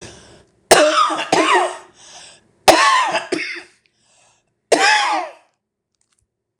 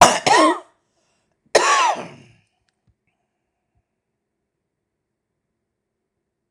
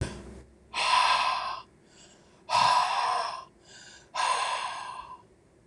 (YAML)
three_cough_length: 6.6 s
three_cough_amplitude: 26028
three_cough_signal_mean_std_ratio: 0.48
cough_length: 6.5 s
cough_amplitude: 26028
cough_signal_mean_std_ratio: 0.29
exhalation_length: 5.7 s
exhalation_amplitude: 11152
exhalation_signal_mean_std_ratio: 0.61
survey_phase: beta (2021-08-13 to 2022-03-07)
age: 65+
gender: Female
wearing_mask: 'No'
symptom_cough_any: true
symptom_fatigue: true
smoker_status: Never smoked
respiratory_condition_asthma: false
respiratory_condition_other: false
recruitment_source: REACT
submission_delay: 2 days
covid_test_result: Negative
covid_test_method: RT-qPCR
influenza_a_test_result: Negative
influenza_b_test_result: Negative